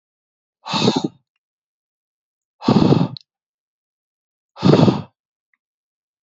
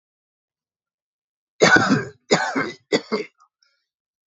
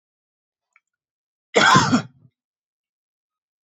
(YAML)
exhalation_length: 6.2 s
exhalation_amplitude: 27526
exhalation_signal_mean_std_ratio: 0.32
three_cough_length: 4.3 s
three_cough_amplitude: 32767
three_cough_signal_mean_std_ratio: 0.35
cough_length: 3.7 s
cough_amplitude: 27212
cough_signal_mean_std_ratio: 0.28
survey_phase: beta (2021-08-13 to 2022-03-07)
age: 18-44
gender: Male
wearing_mask: 'No'
symptom_other: true
symptom_onset: 12 days
smoker_status: Never smoked
respiratory_condition_asthma: false
respiratory_condition_other: false
recruitment_source: REACT
submission_delay: 1 day
covid_test_result: Negative
covid_test_method: RT-qPCR